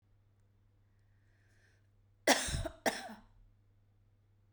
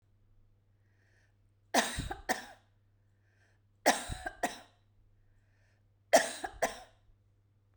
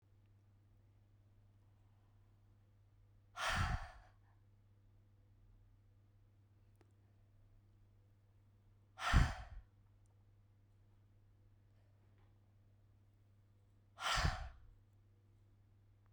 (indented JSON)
{
  "cough_length": "4.5 s",
  "cough_amplitude": 7773,
  "cough_signal_mean_std_ratio": 0.27,
  "three_cough_length": "7.8 s",
  "three_cough_amplitude": 10715,
  "three_cough_signal_mean_std_ratio": 0.28,
  "exhalation_length": "16.1 s",
  "exhalation_amplitude": 4619,
  "exhalation_signal_mean_std_ratio": 0.27,
  "survey_phase": "beta (2021-08-13 to 2022-03-07)",
  "age": "45-64",
  "gender": "Female",
  "wearing_mask": "No",
  "symptom_none": true,
  "smoker_status": "Ex-smoker",
  "respiratory_condition_asthma": false,
  "respiratory_condition_other": false,
  "recruitment_source": "REACT",
  "submission_delay": "0 days",
  "covid_test_result": "Negative",
  "covid_test_method": "RT-qPCR",
  "influenza_a_test_result": "Negative",
  "influenza_b_test_result": "Negative"
}